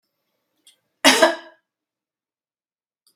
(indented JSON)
{
  "cough_length": "3.2 s",
  "cough_amplitude": 32768,
  "cough_signal_mean_std_ratio": 0.23,
  "survey_phase": "beta (2021-08-13 to 2022-03-07)",
  "age": "45-64",
  "gender": "Female",
  "wearing_mask": "No",
  "symptom_none": true,
  "smoker_status": "Never smoked",
  "respiratory_condition_asthma": false,
  "respiratory_condition_other": false,
  "recruitment_source": "REACT",
  "submission_delay": "6 days",
  "covid_test_result": "Negative",
  "covid_test_method": "RT-qPCR"
}